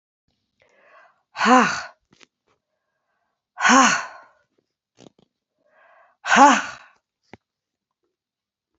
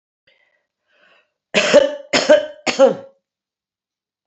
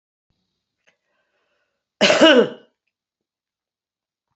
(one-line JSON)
{"exhalation_length": "8.8 s", "exhalation_amplitude": 29426, "exhalation_signal_mean_std_ratio": 0.28, "three_cough_length": "4.3 s", "three_cough_amplitude": 32767, "three_cough_signal_mean_std_ratio": 0.35, "cough_length": "4.4 s", "cough_amplitude": 29213, "cough_signal_mean_std_ratio": 0.26, "survey_phase": "beta (2021-08-13 to 2022-03-07)", "age": "65+", "gender": "Female", "wearing_mask": "No", "symptom_runny_or_blocked_nose": true, "symptom_headache": true, "smoker_status": "Current smoker (1 to 10 cigarettes per day)", "respiratory_condition_asthma": false, "respiratory_condition_other": false, "recruitment_source": "Test and Trace", "submission_delay": "1 day", "covid_test_result": "Positive", "covid_test_method": "RT-qPCR", "covid_ct_value": 20.9, "covid_ct_gene": "ORF1ab gene"}